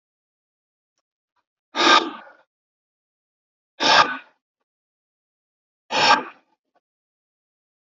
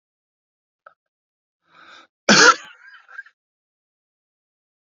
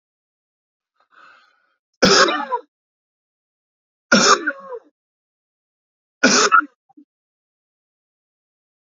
{"exhalation_length": "7.9 s", "exhalation_amplitude": 27346, "exhalation_signal_mean_std_ratio": 0.26, "cough_length": "4.9 s", "cough_amplitude": 32768, "cough_signal_mean_std_ratio": 0.2, "three_cough_length": "9.0 s", "three_cough_amplitude": 29409, "three_cough_signal_mean_std_ratio": 0.29, "survey_phase": "beta (2021-08-13 to 2022-03-07)", "age": "45-64", "gender": "Male", "wearing_mask": "No", "symptom_cough_any": true, "symptom_onset": "12 days", "smoker_status": "Never smoked", "respiratory_condition_asthma": false, "respiratory_condition_other": false, "recruitment_source": "REACT", "submission_delay": "1 day", "covid_test_result": "Positive", "covid_test_method": "RT-qPCR", "covid_ct_value": 33.0, "covid_ct_gene": "E gene", "influenza_a_test_result": "Negative", "influenza_b_test_result": "Negative"}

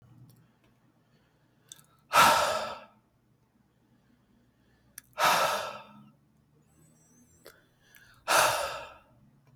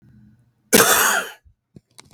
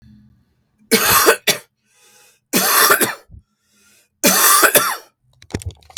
{"exhalation_length": "9.6 s", "exhalation_amplitude": 13267, "exhalation_signal_mean_std_ratio": 0.32, "cough_length": "2.1 s", "cough_amplitude": 32768, "cough_signal_mean_std_ratio": 0.4, "three_cough_length": "6.0 s", "three_cough_amplitude": 32768, "three_cough_signal_mean_std_ratio": 0.47, "survey_phase": "beta (2021-08-13 to 2022-03-07)", "age": "18-44", "gender": "Male", "wearing_mask": "No", "symptom_cough_any": true, "symptom_runny_or_blocked_nose": true, "symptom_sore_throat": true, "symptom_fatigue": true, "symptom_onset": "5 days", "smoker_status": "Never smoked", "respiratory_condition_asthma": false, "respiratory_condition_other": false, "recruitment_source": "Test and Trace", "submission_delay": "2 days", "covid_test_result": "Negative", "covid_test_method": "ePCR"}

